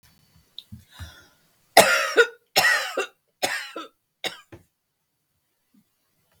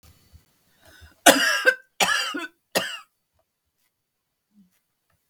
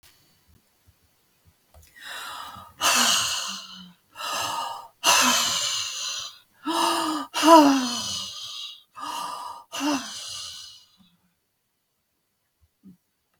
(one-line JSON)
{"three_cough_length": "6.4 s", "three_cough_amplitude": 32767, "three_cough_signal_mean_std_ratio": 0.3, "cough_length": "5.3 s", "cough_amplitude": 32768, "cough_signal_mean_std_ratio": 0.3, "exhalation_length": "13.4 s", "exhalation_amplitude": 25502, "exhalation_signal_mean_std_ratio": 0.45, "survey_phase": "beta (2021-08-13 to 2022-03-07)", "age": "65+", "gender": "Female", "wearing_mask": "No", "symptom_none": true, "smoker_status": "Never smoked", "respiratory_condition_asthma": false, "respiratory_condition_other": false, "recruitment_source": "REACT", "submission_delay": "2 days", "covid_test_result": "Negative", "covid_test_method": "RT-qPCR", "influenza_a_test_result": "Negative", "influenza_b_test_result": "Negative"}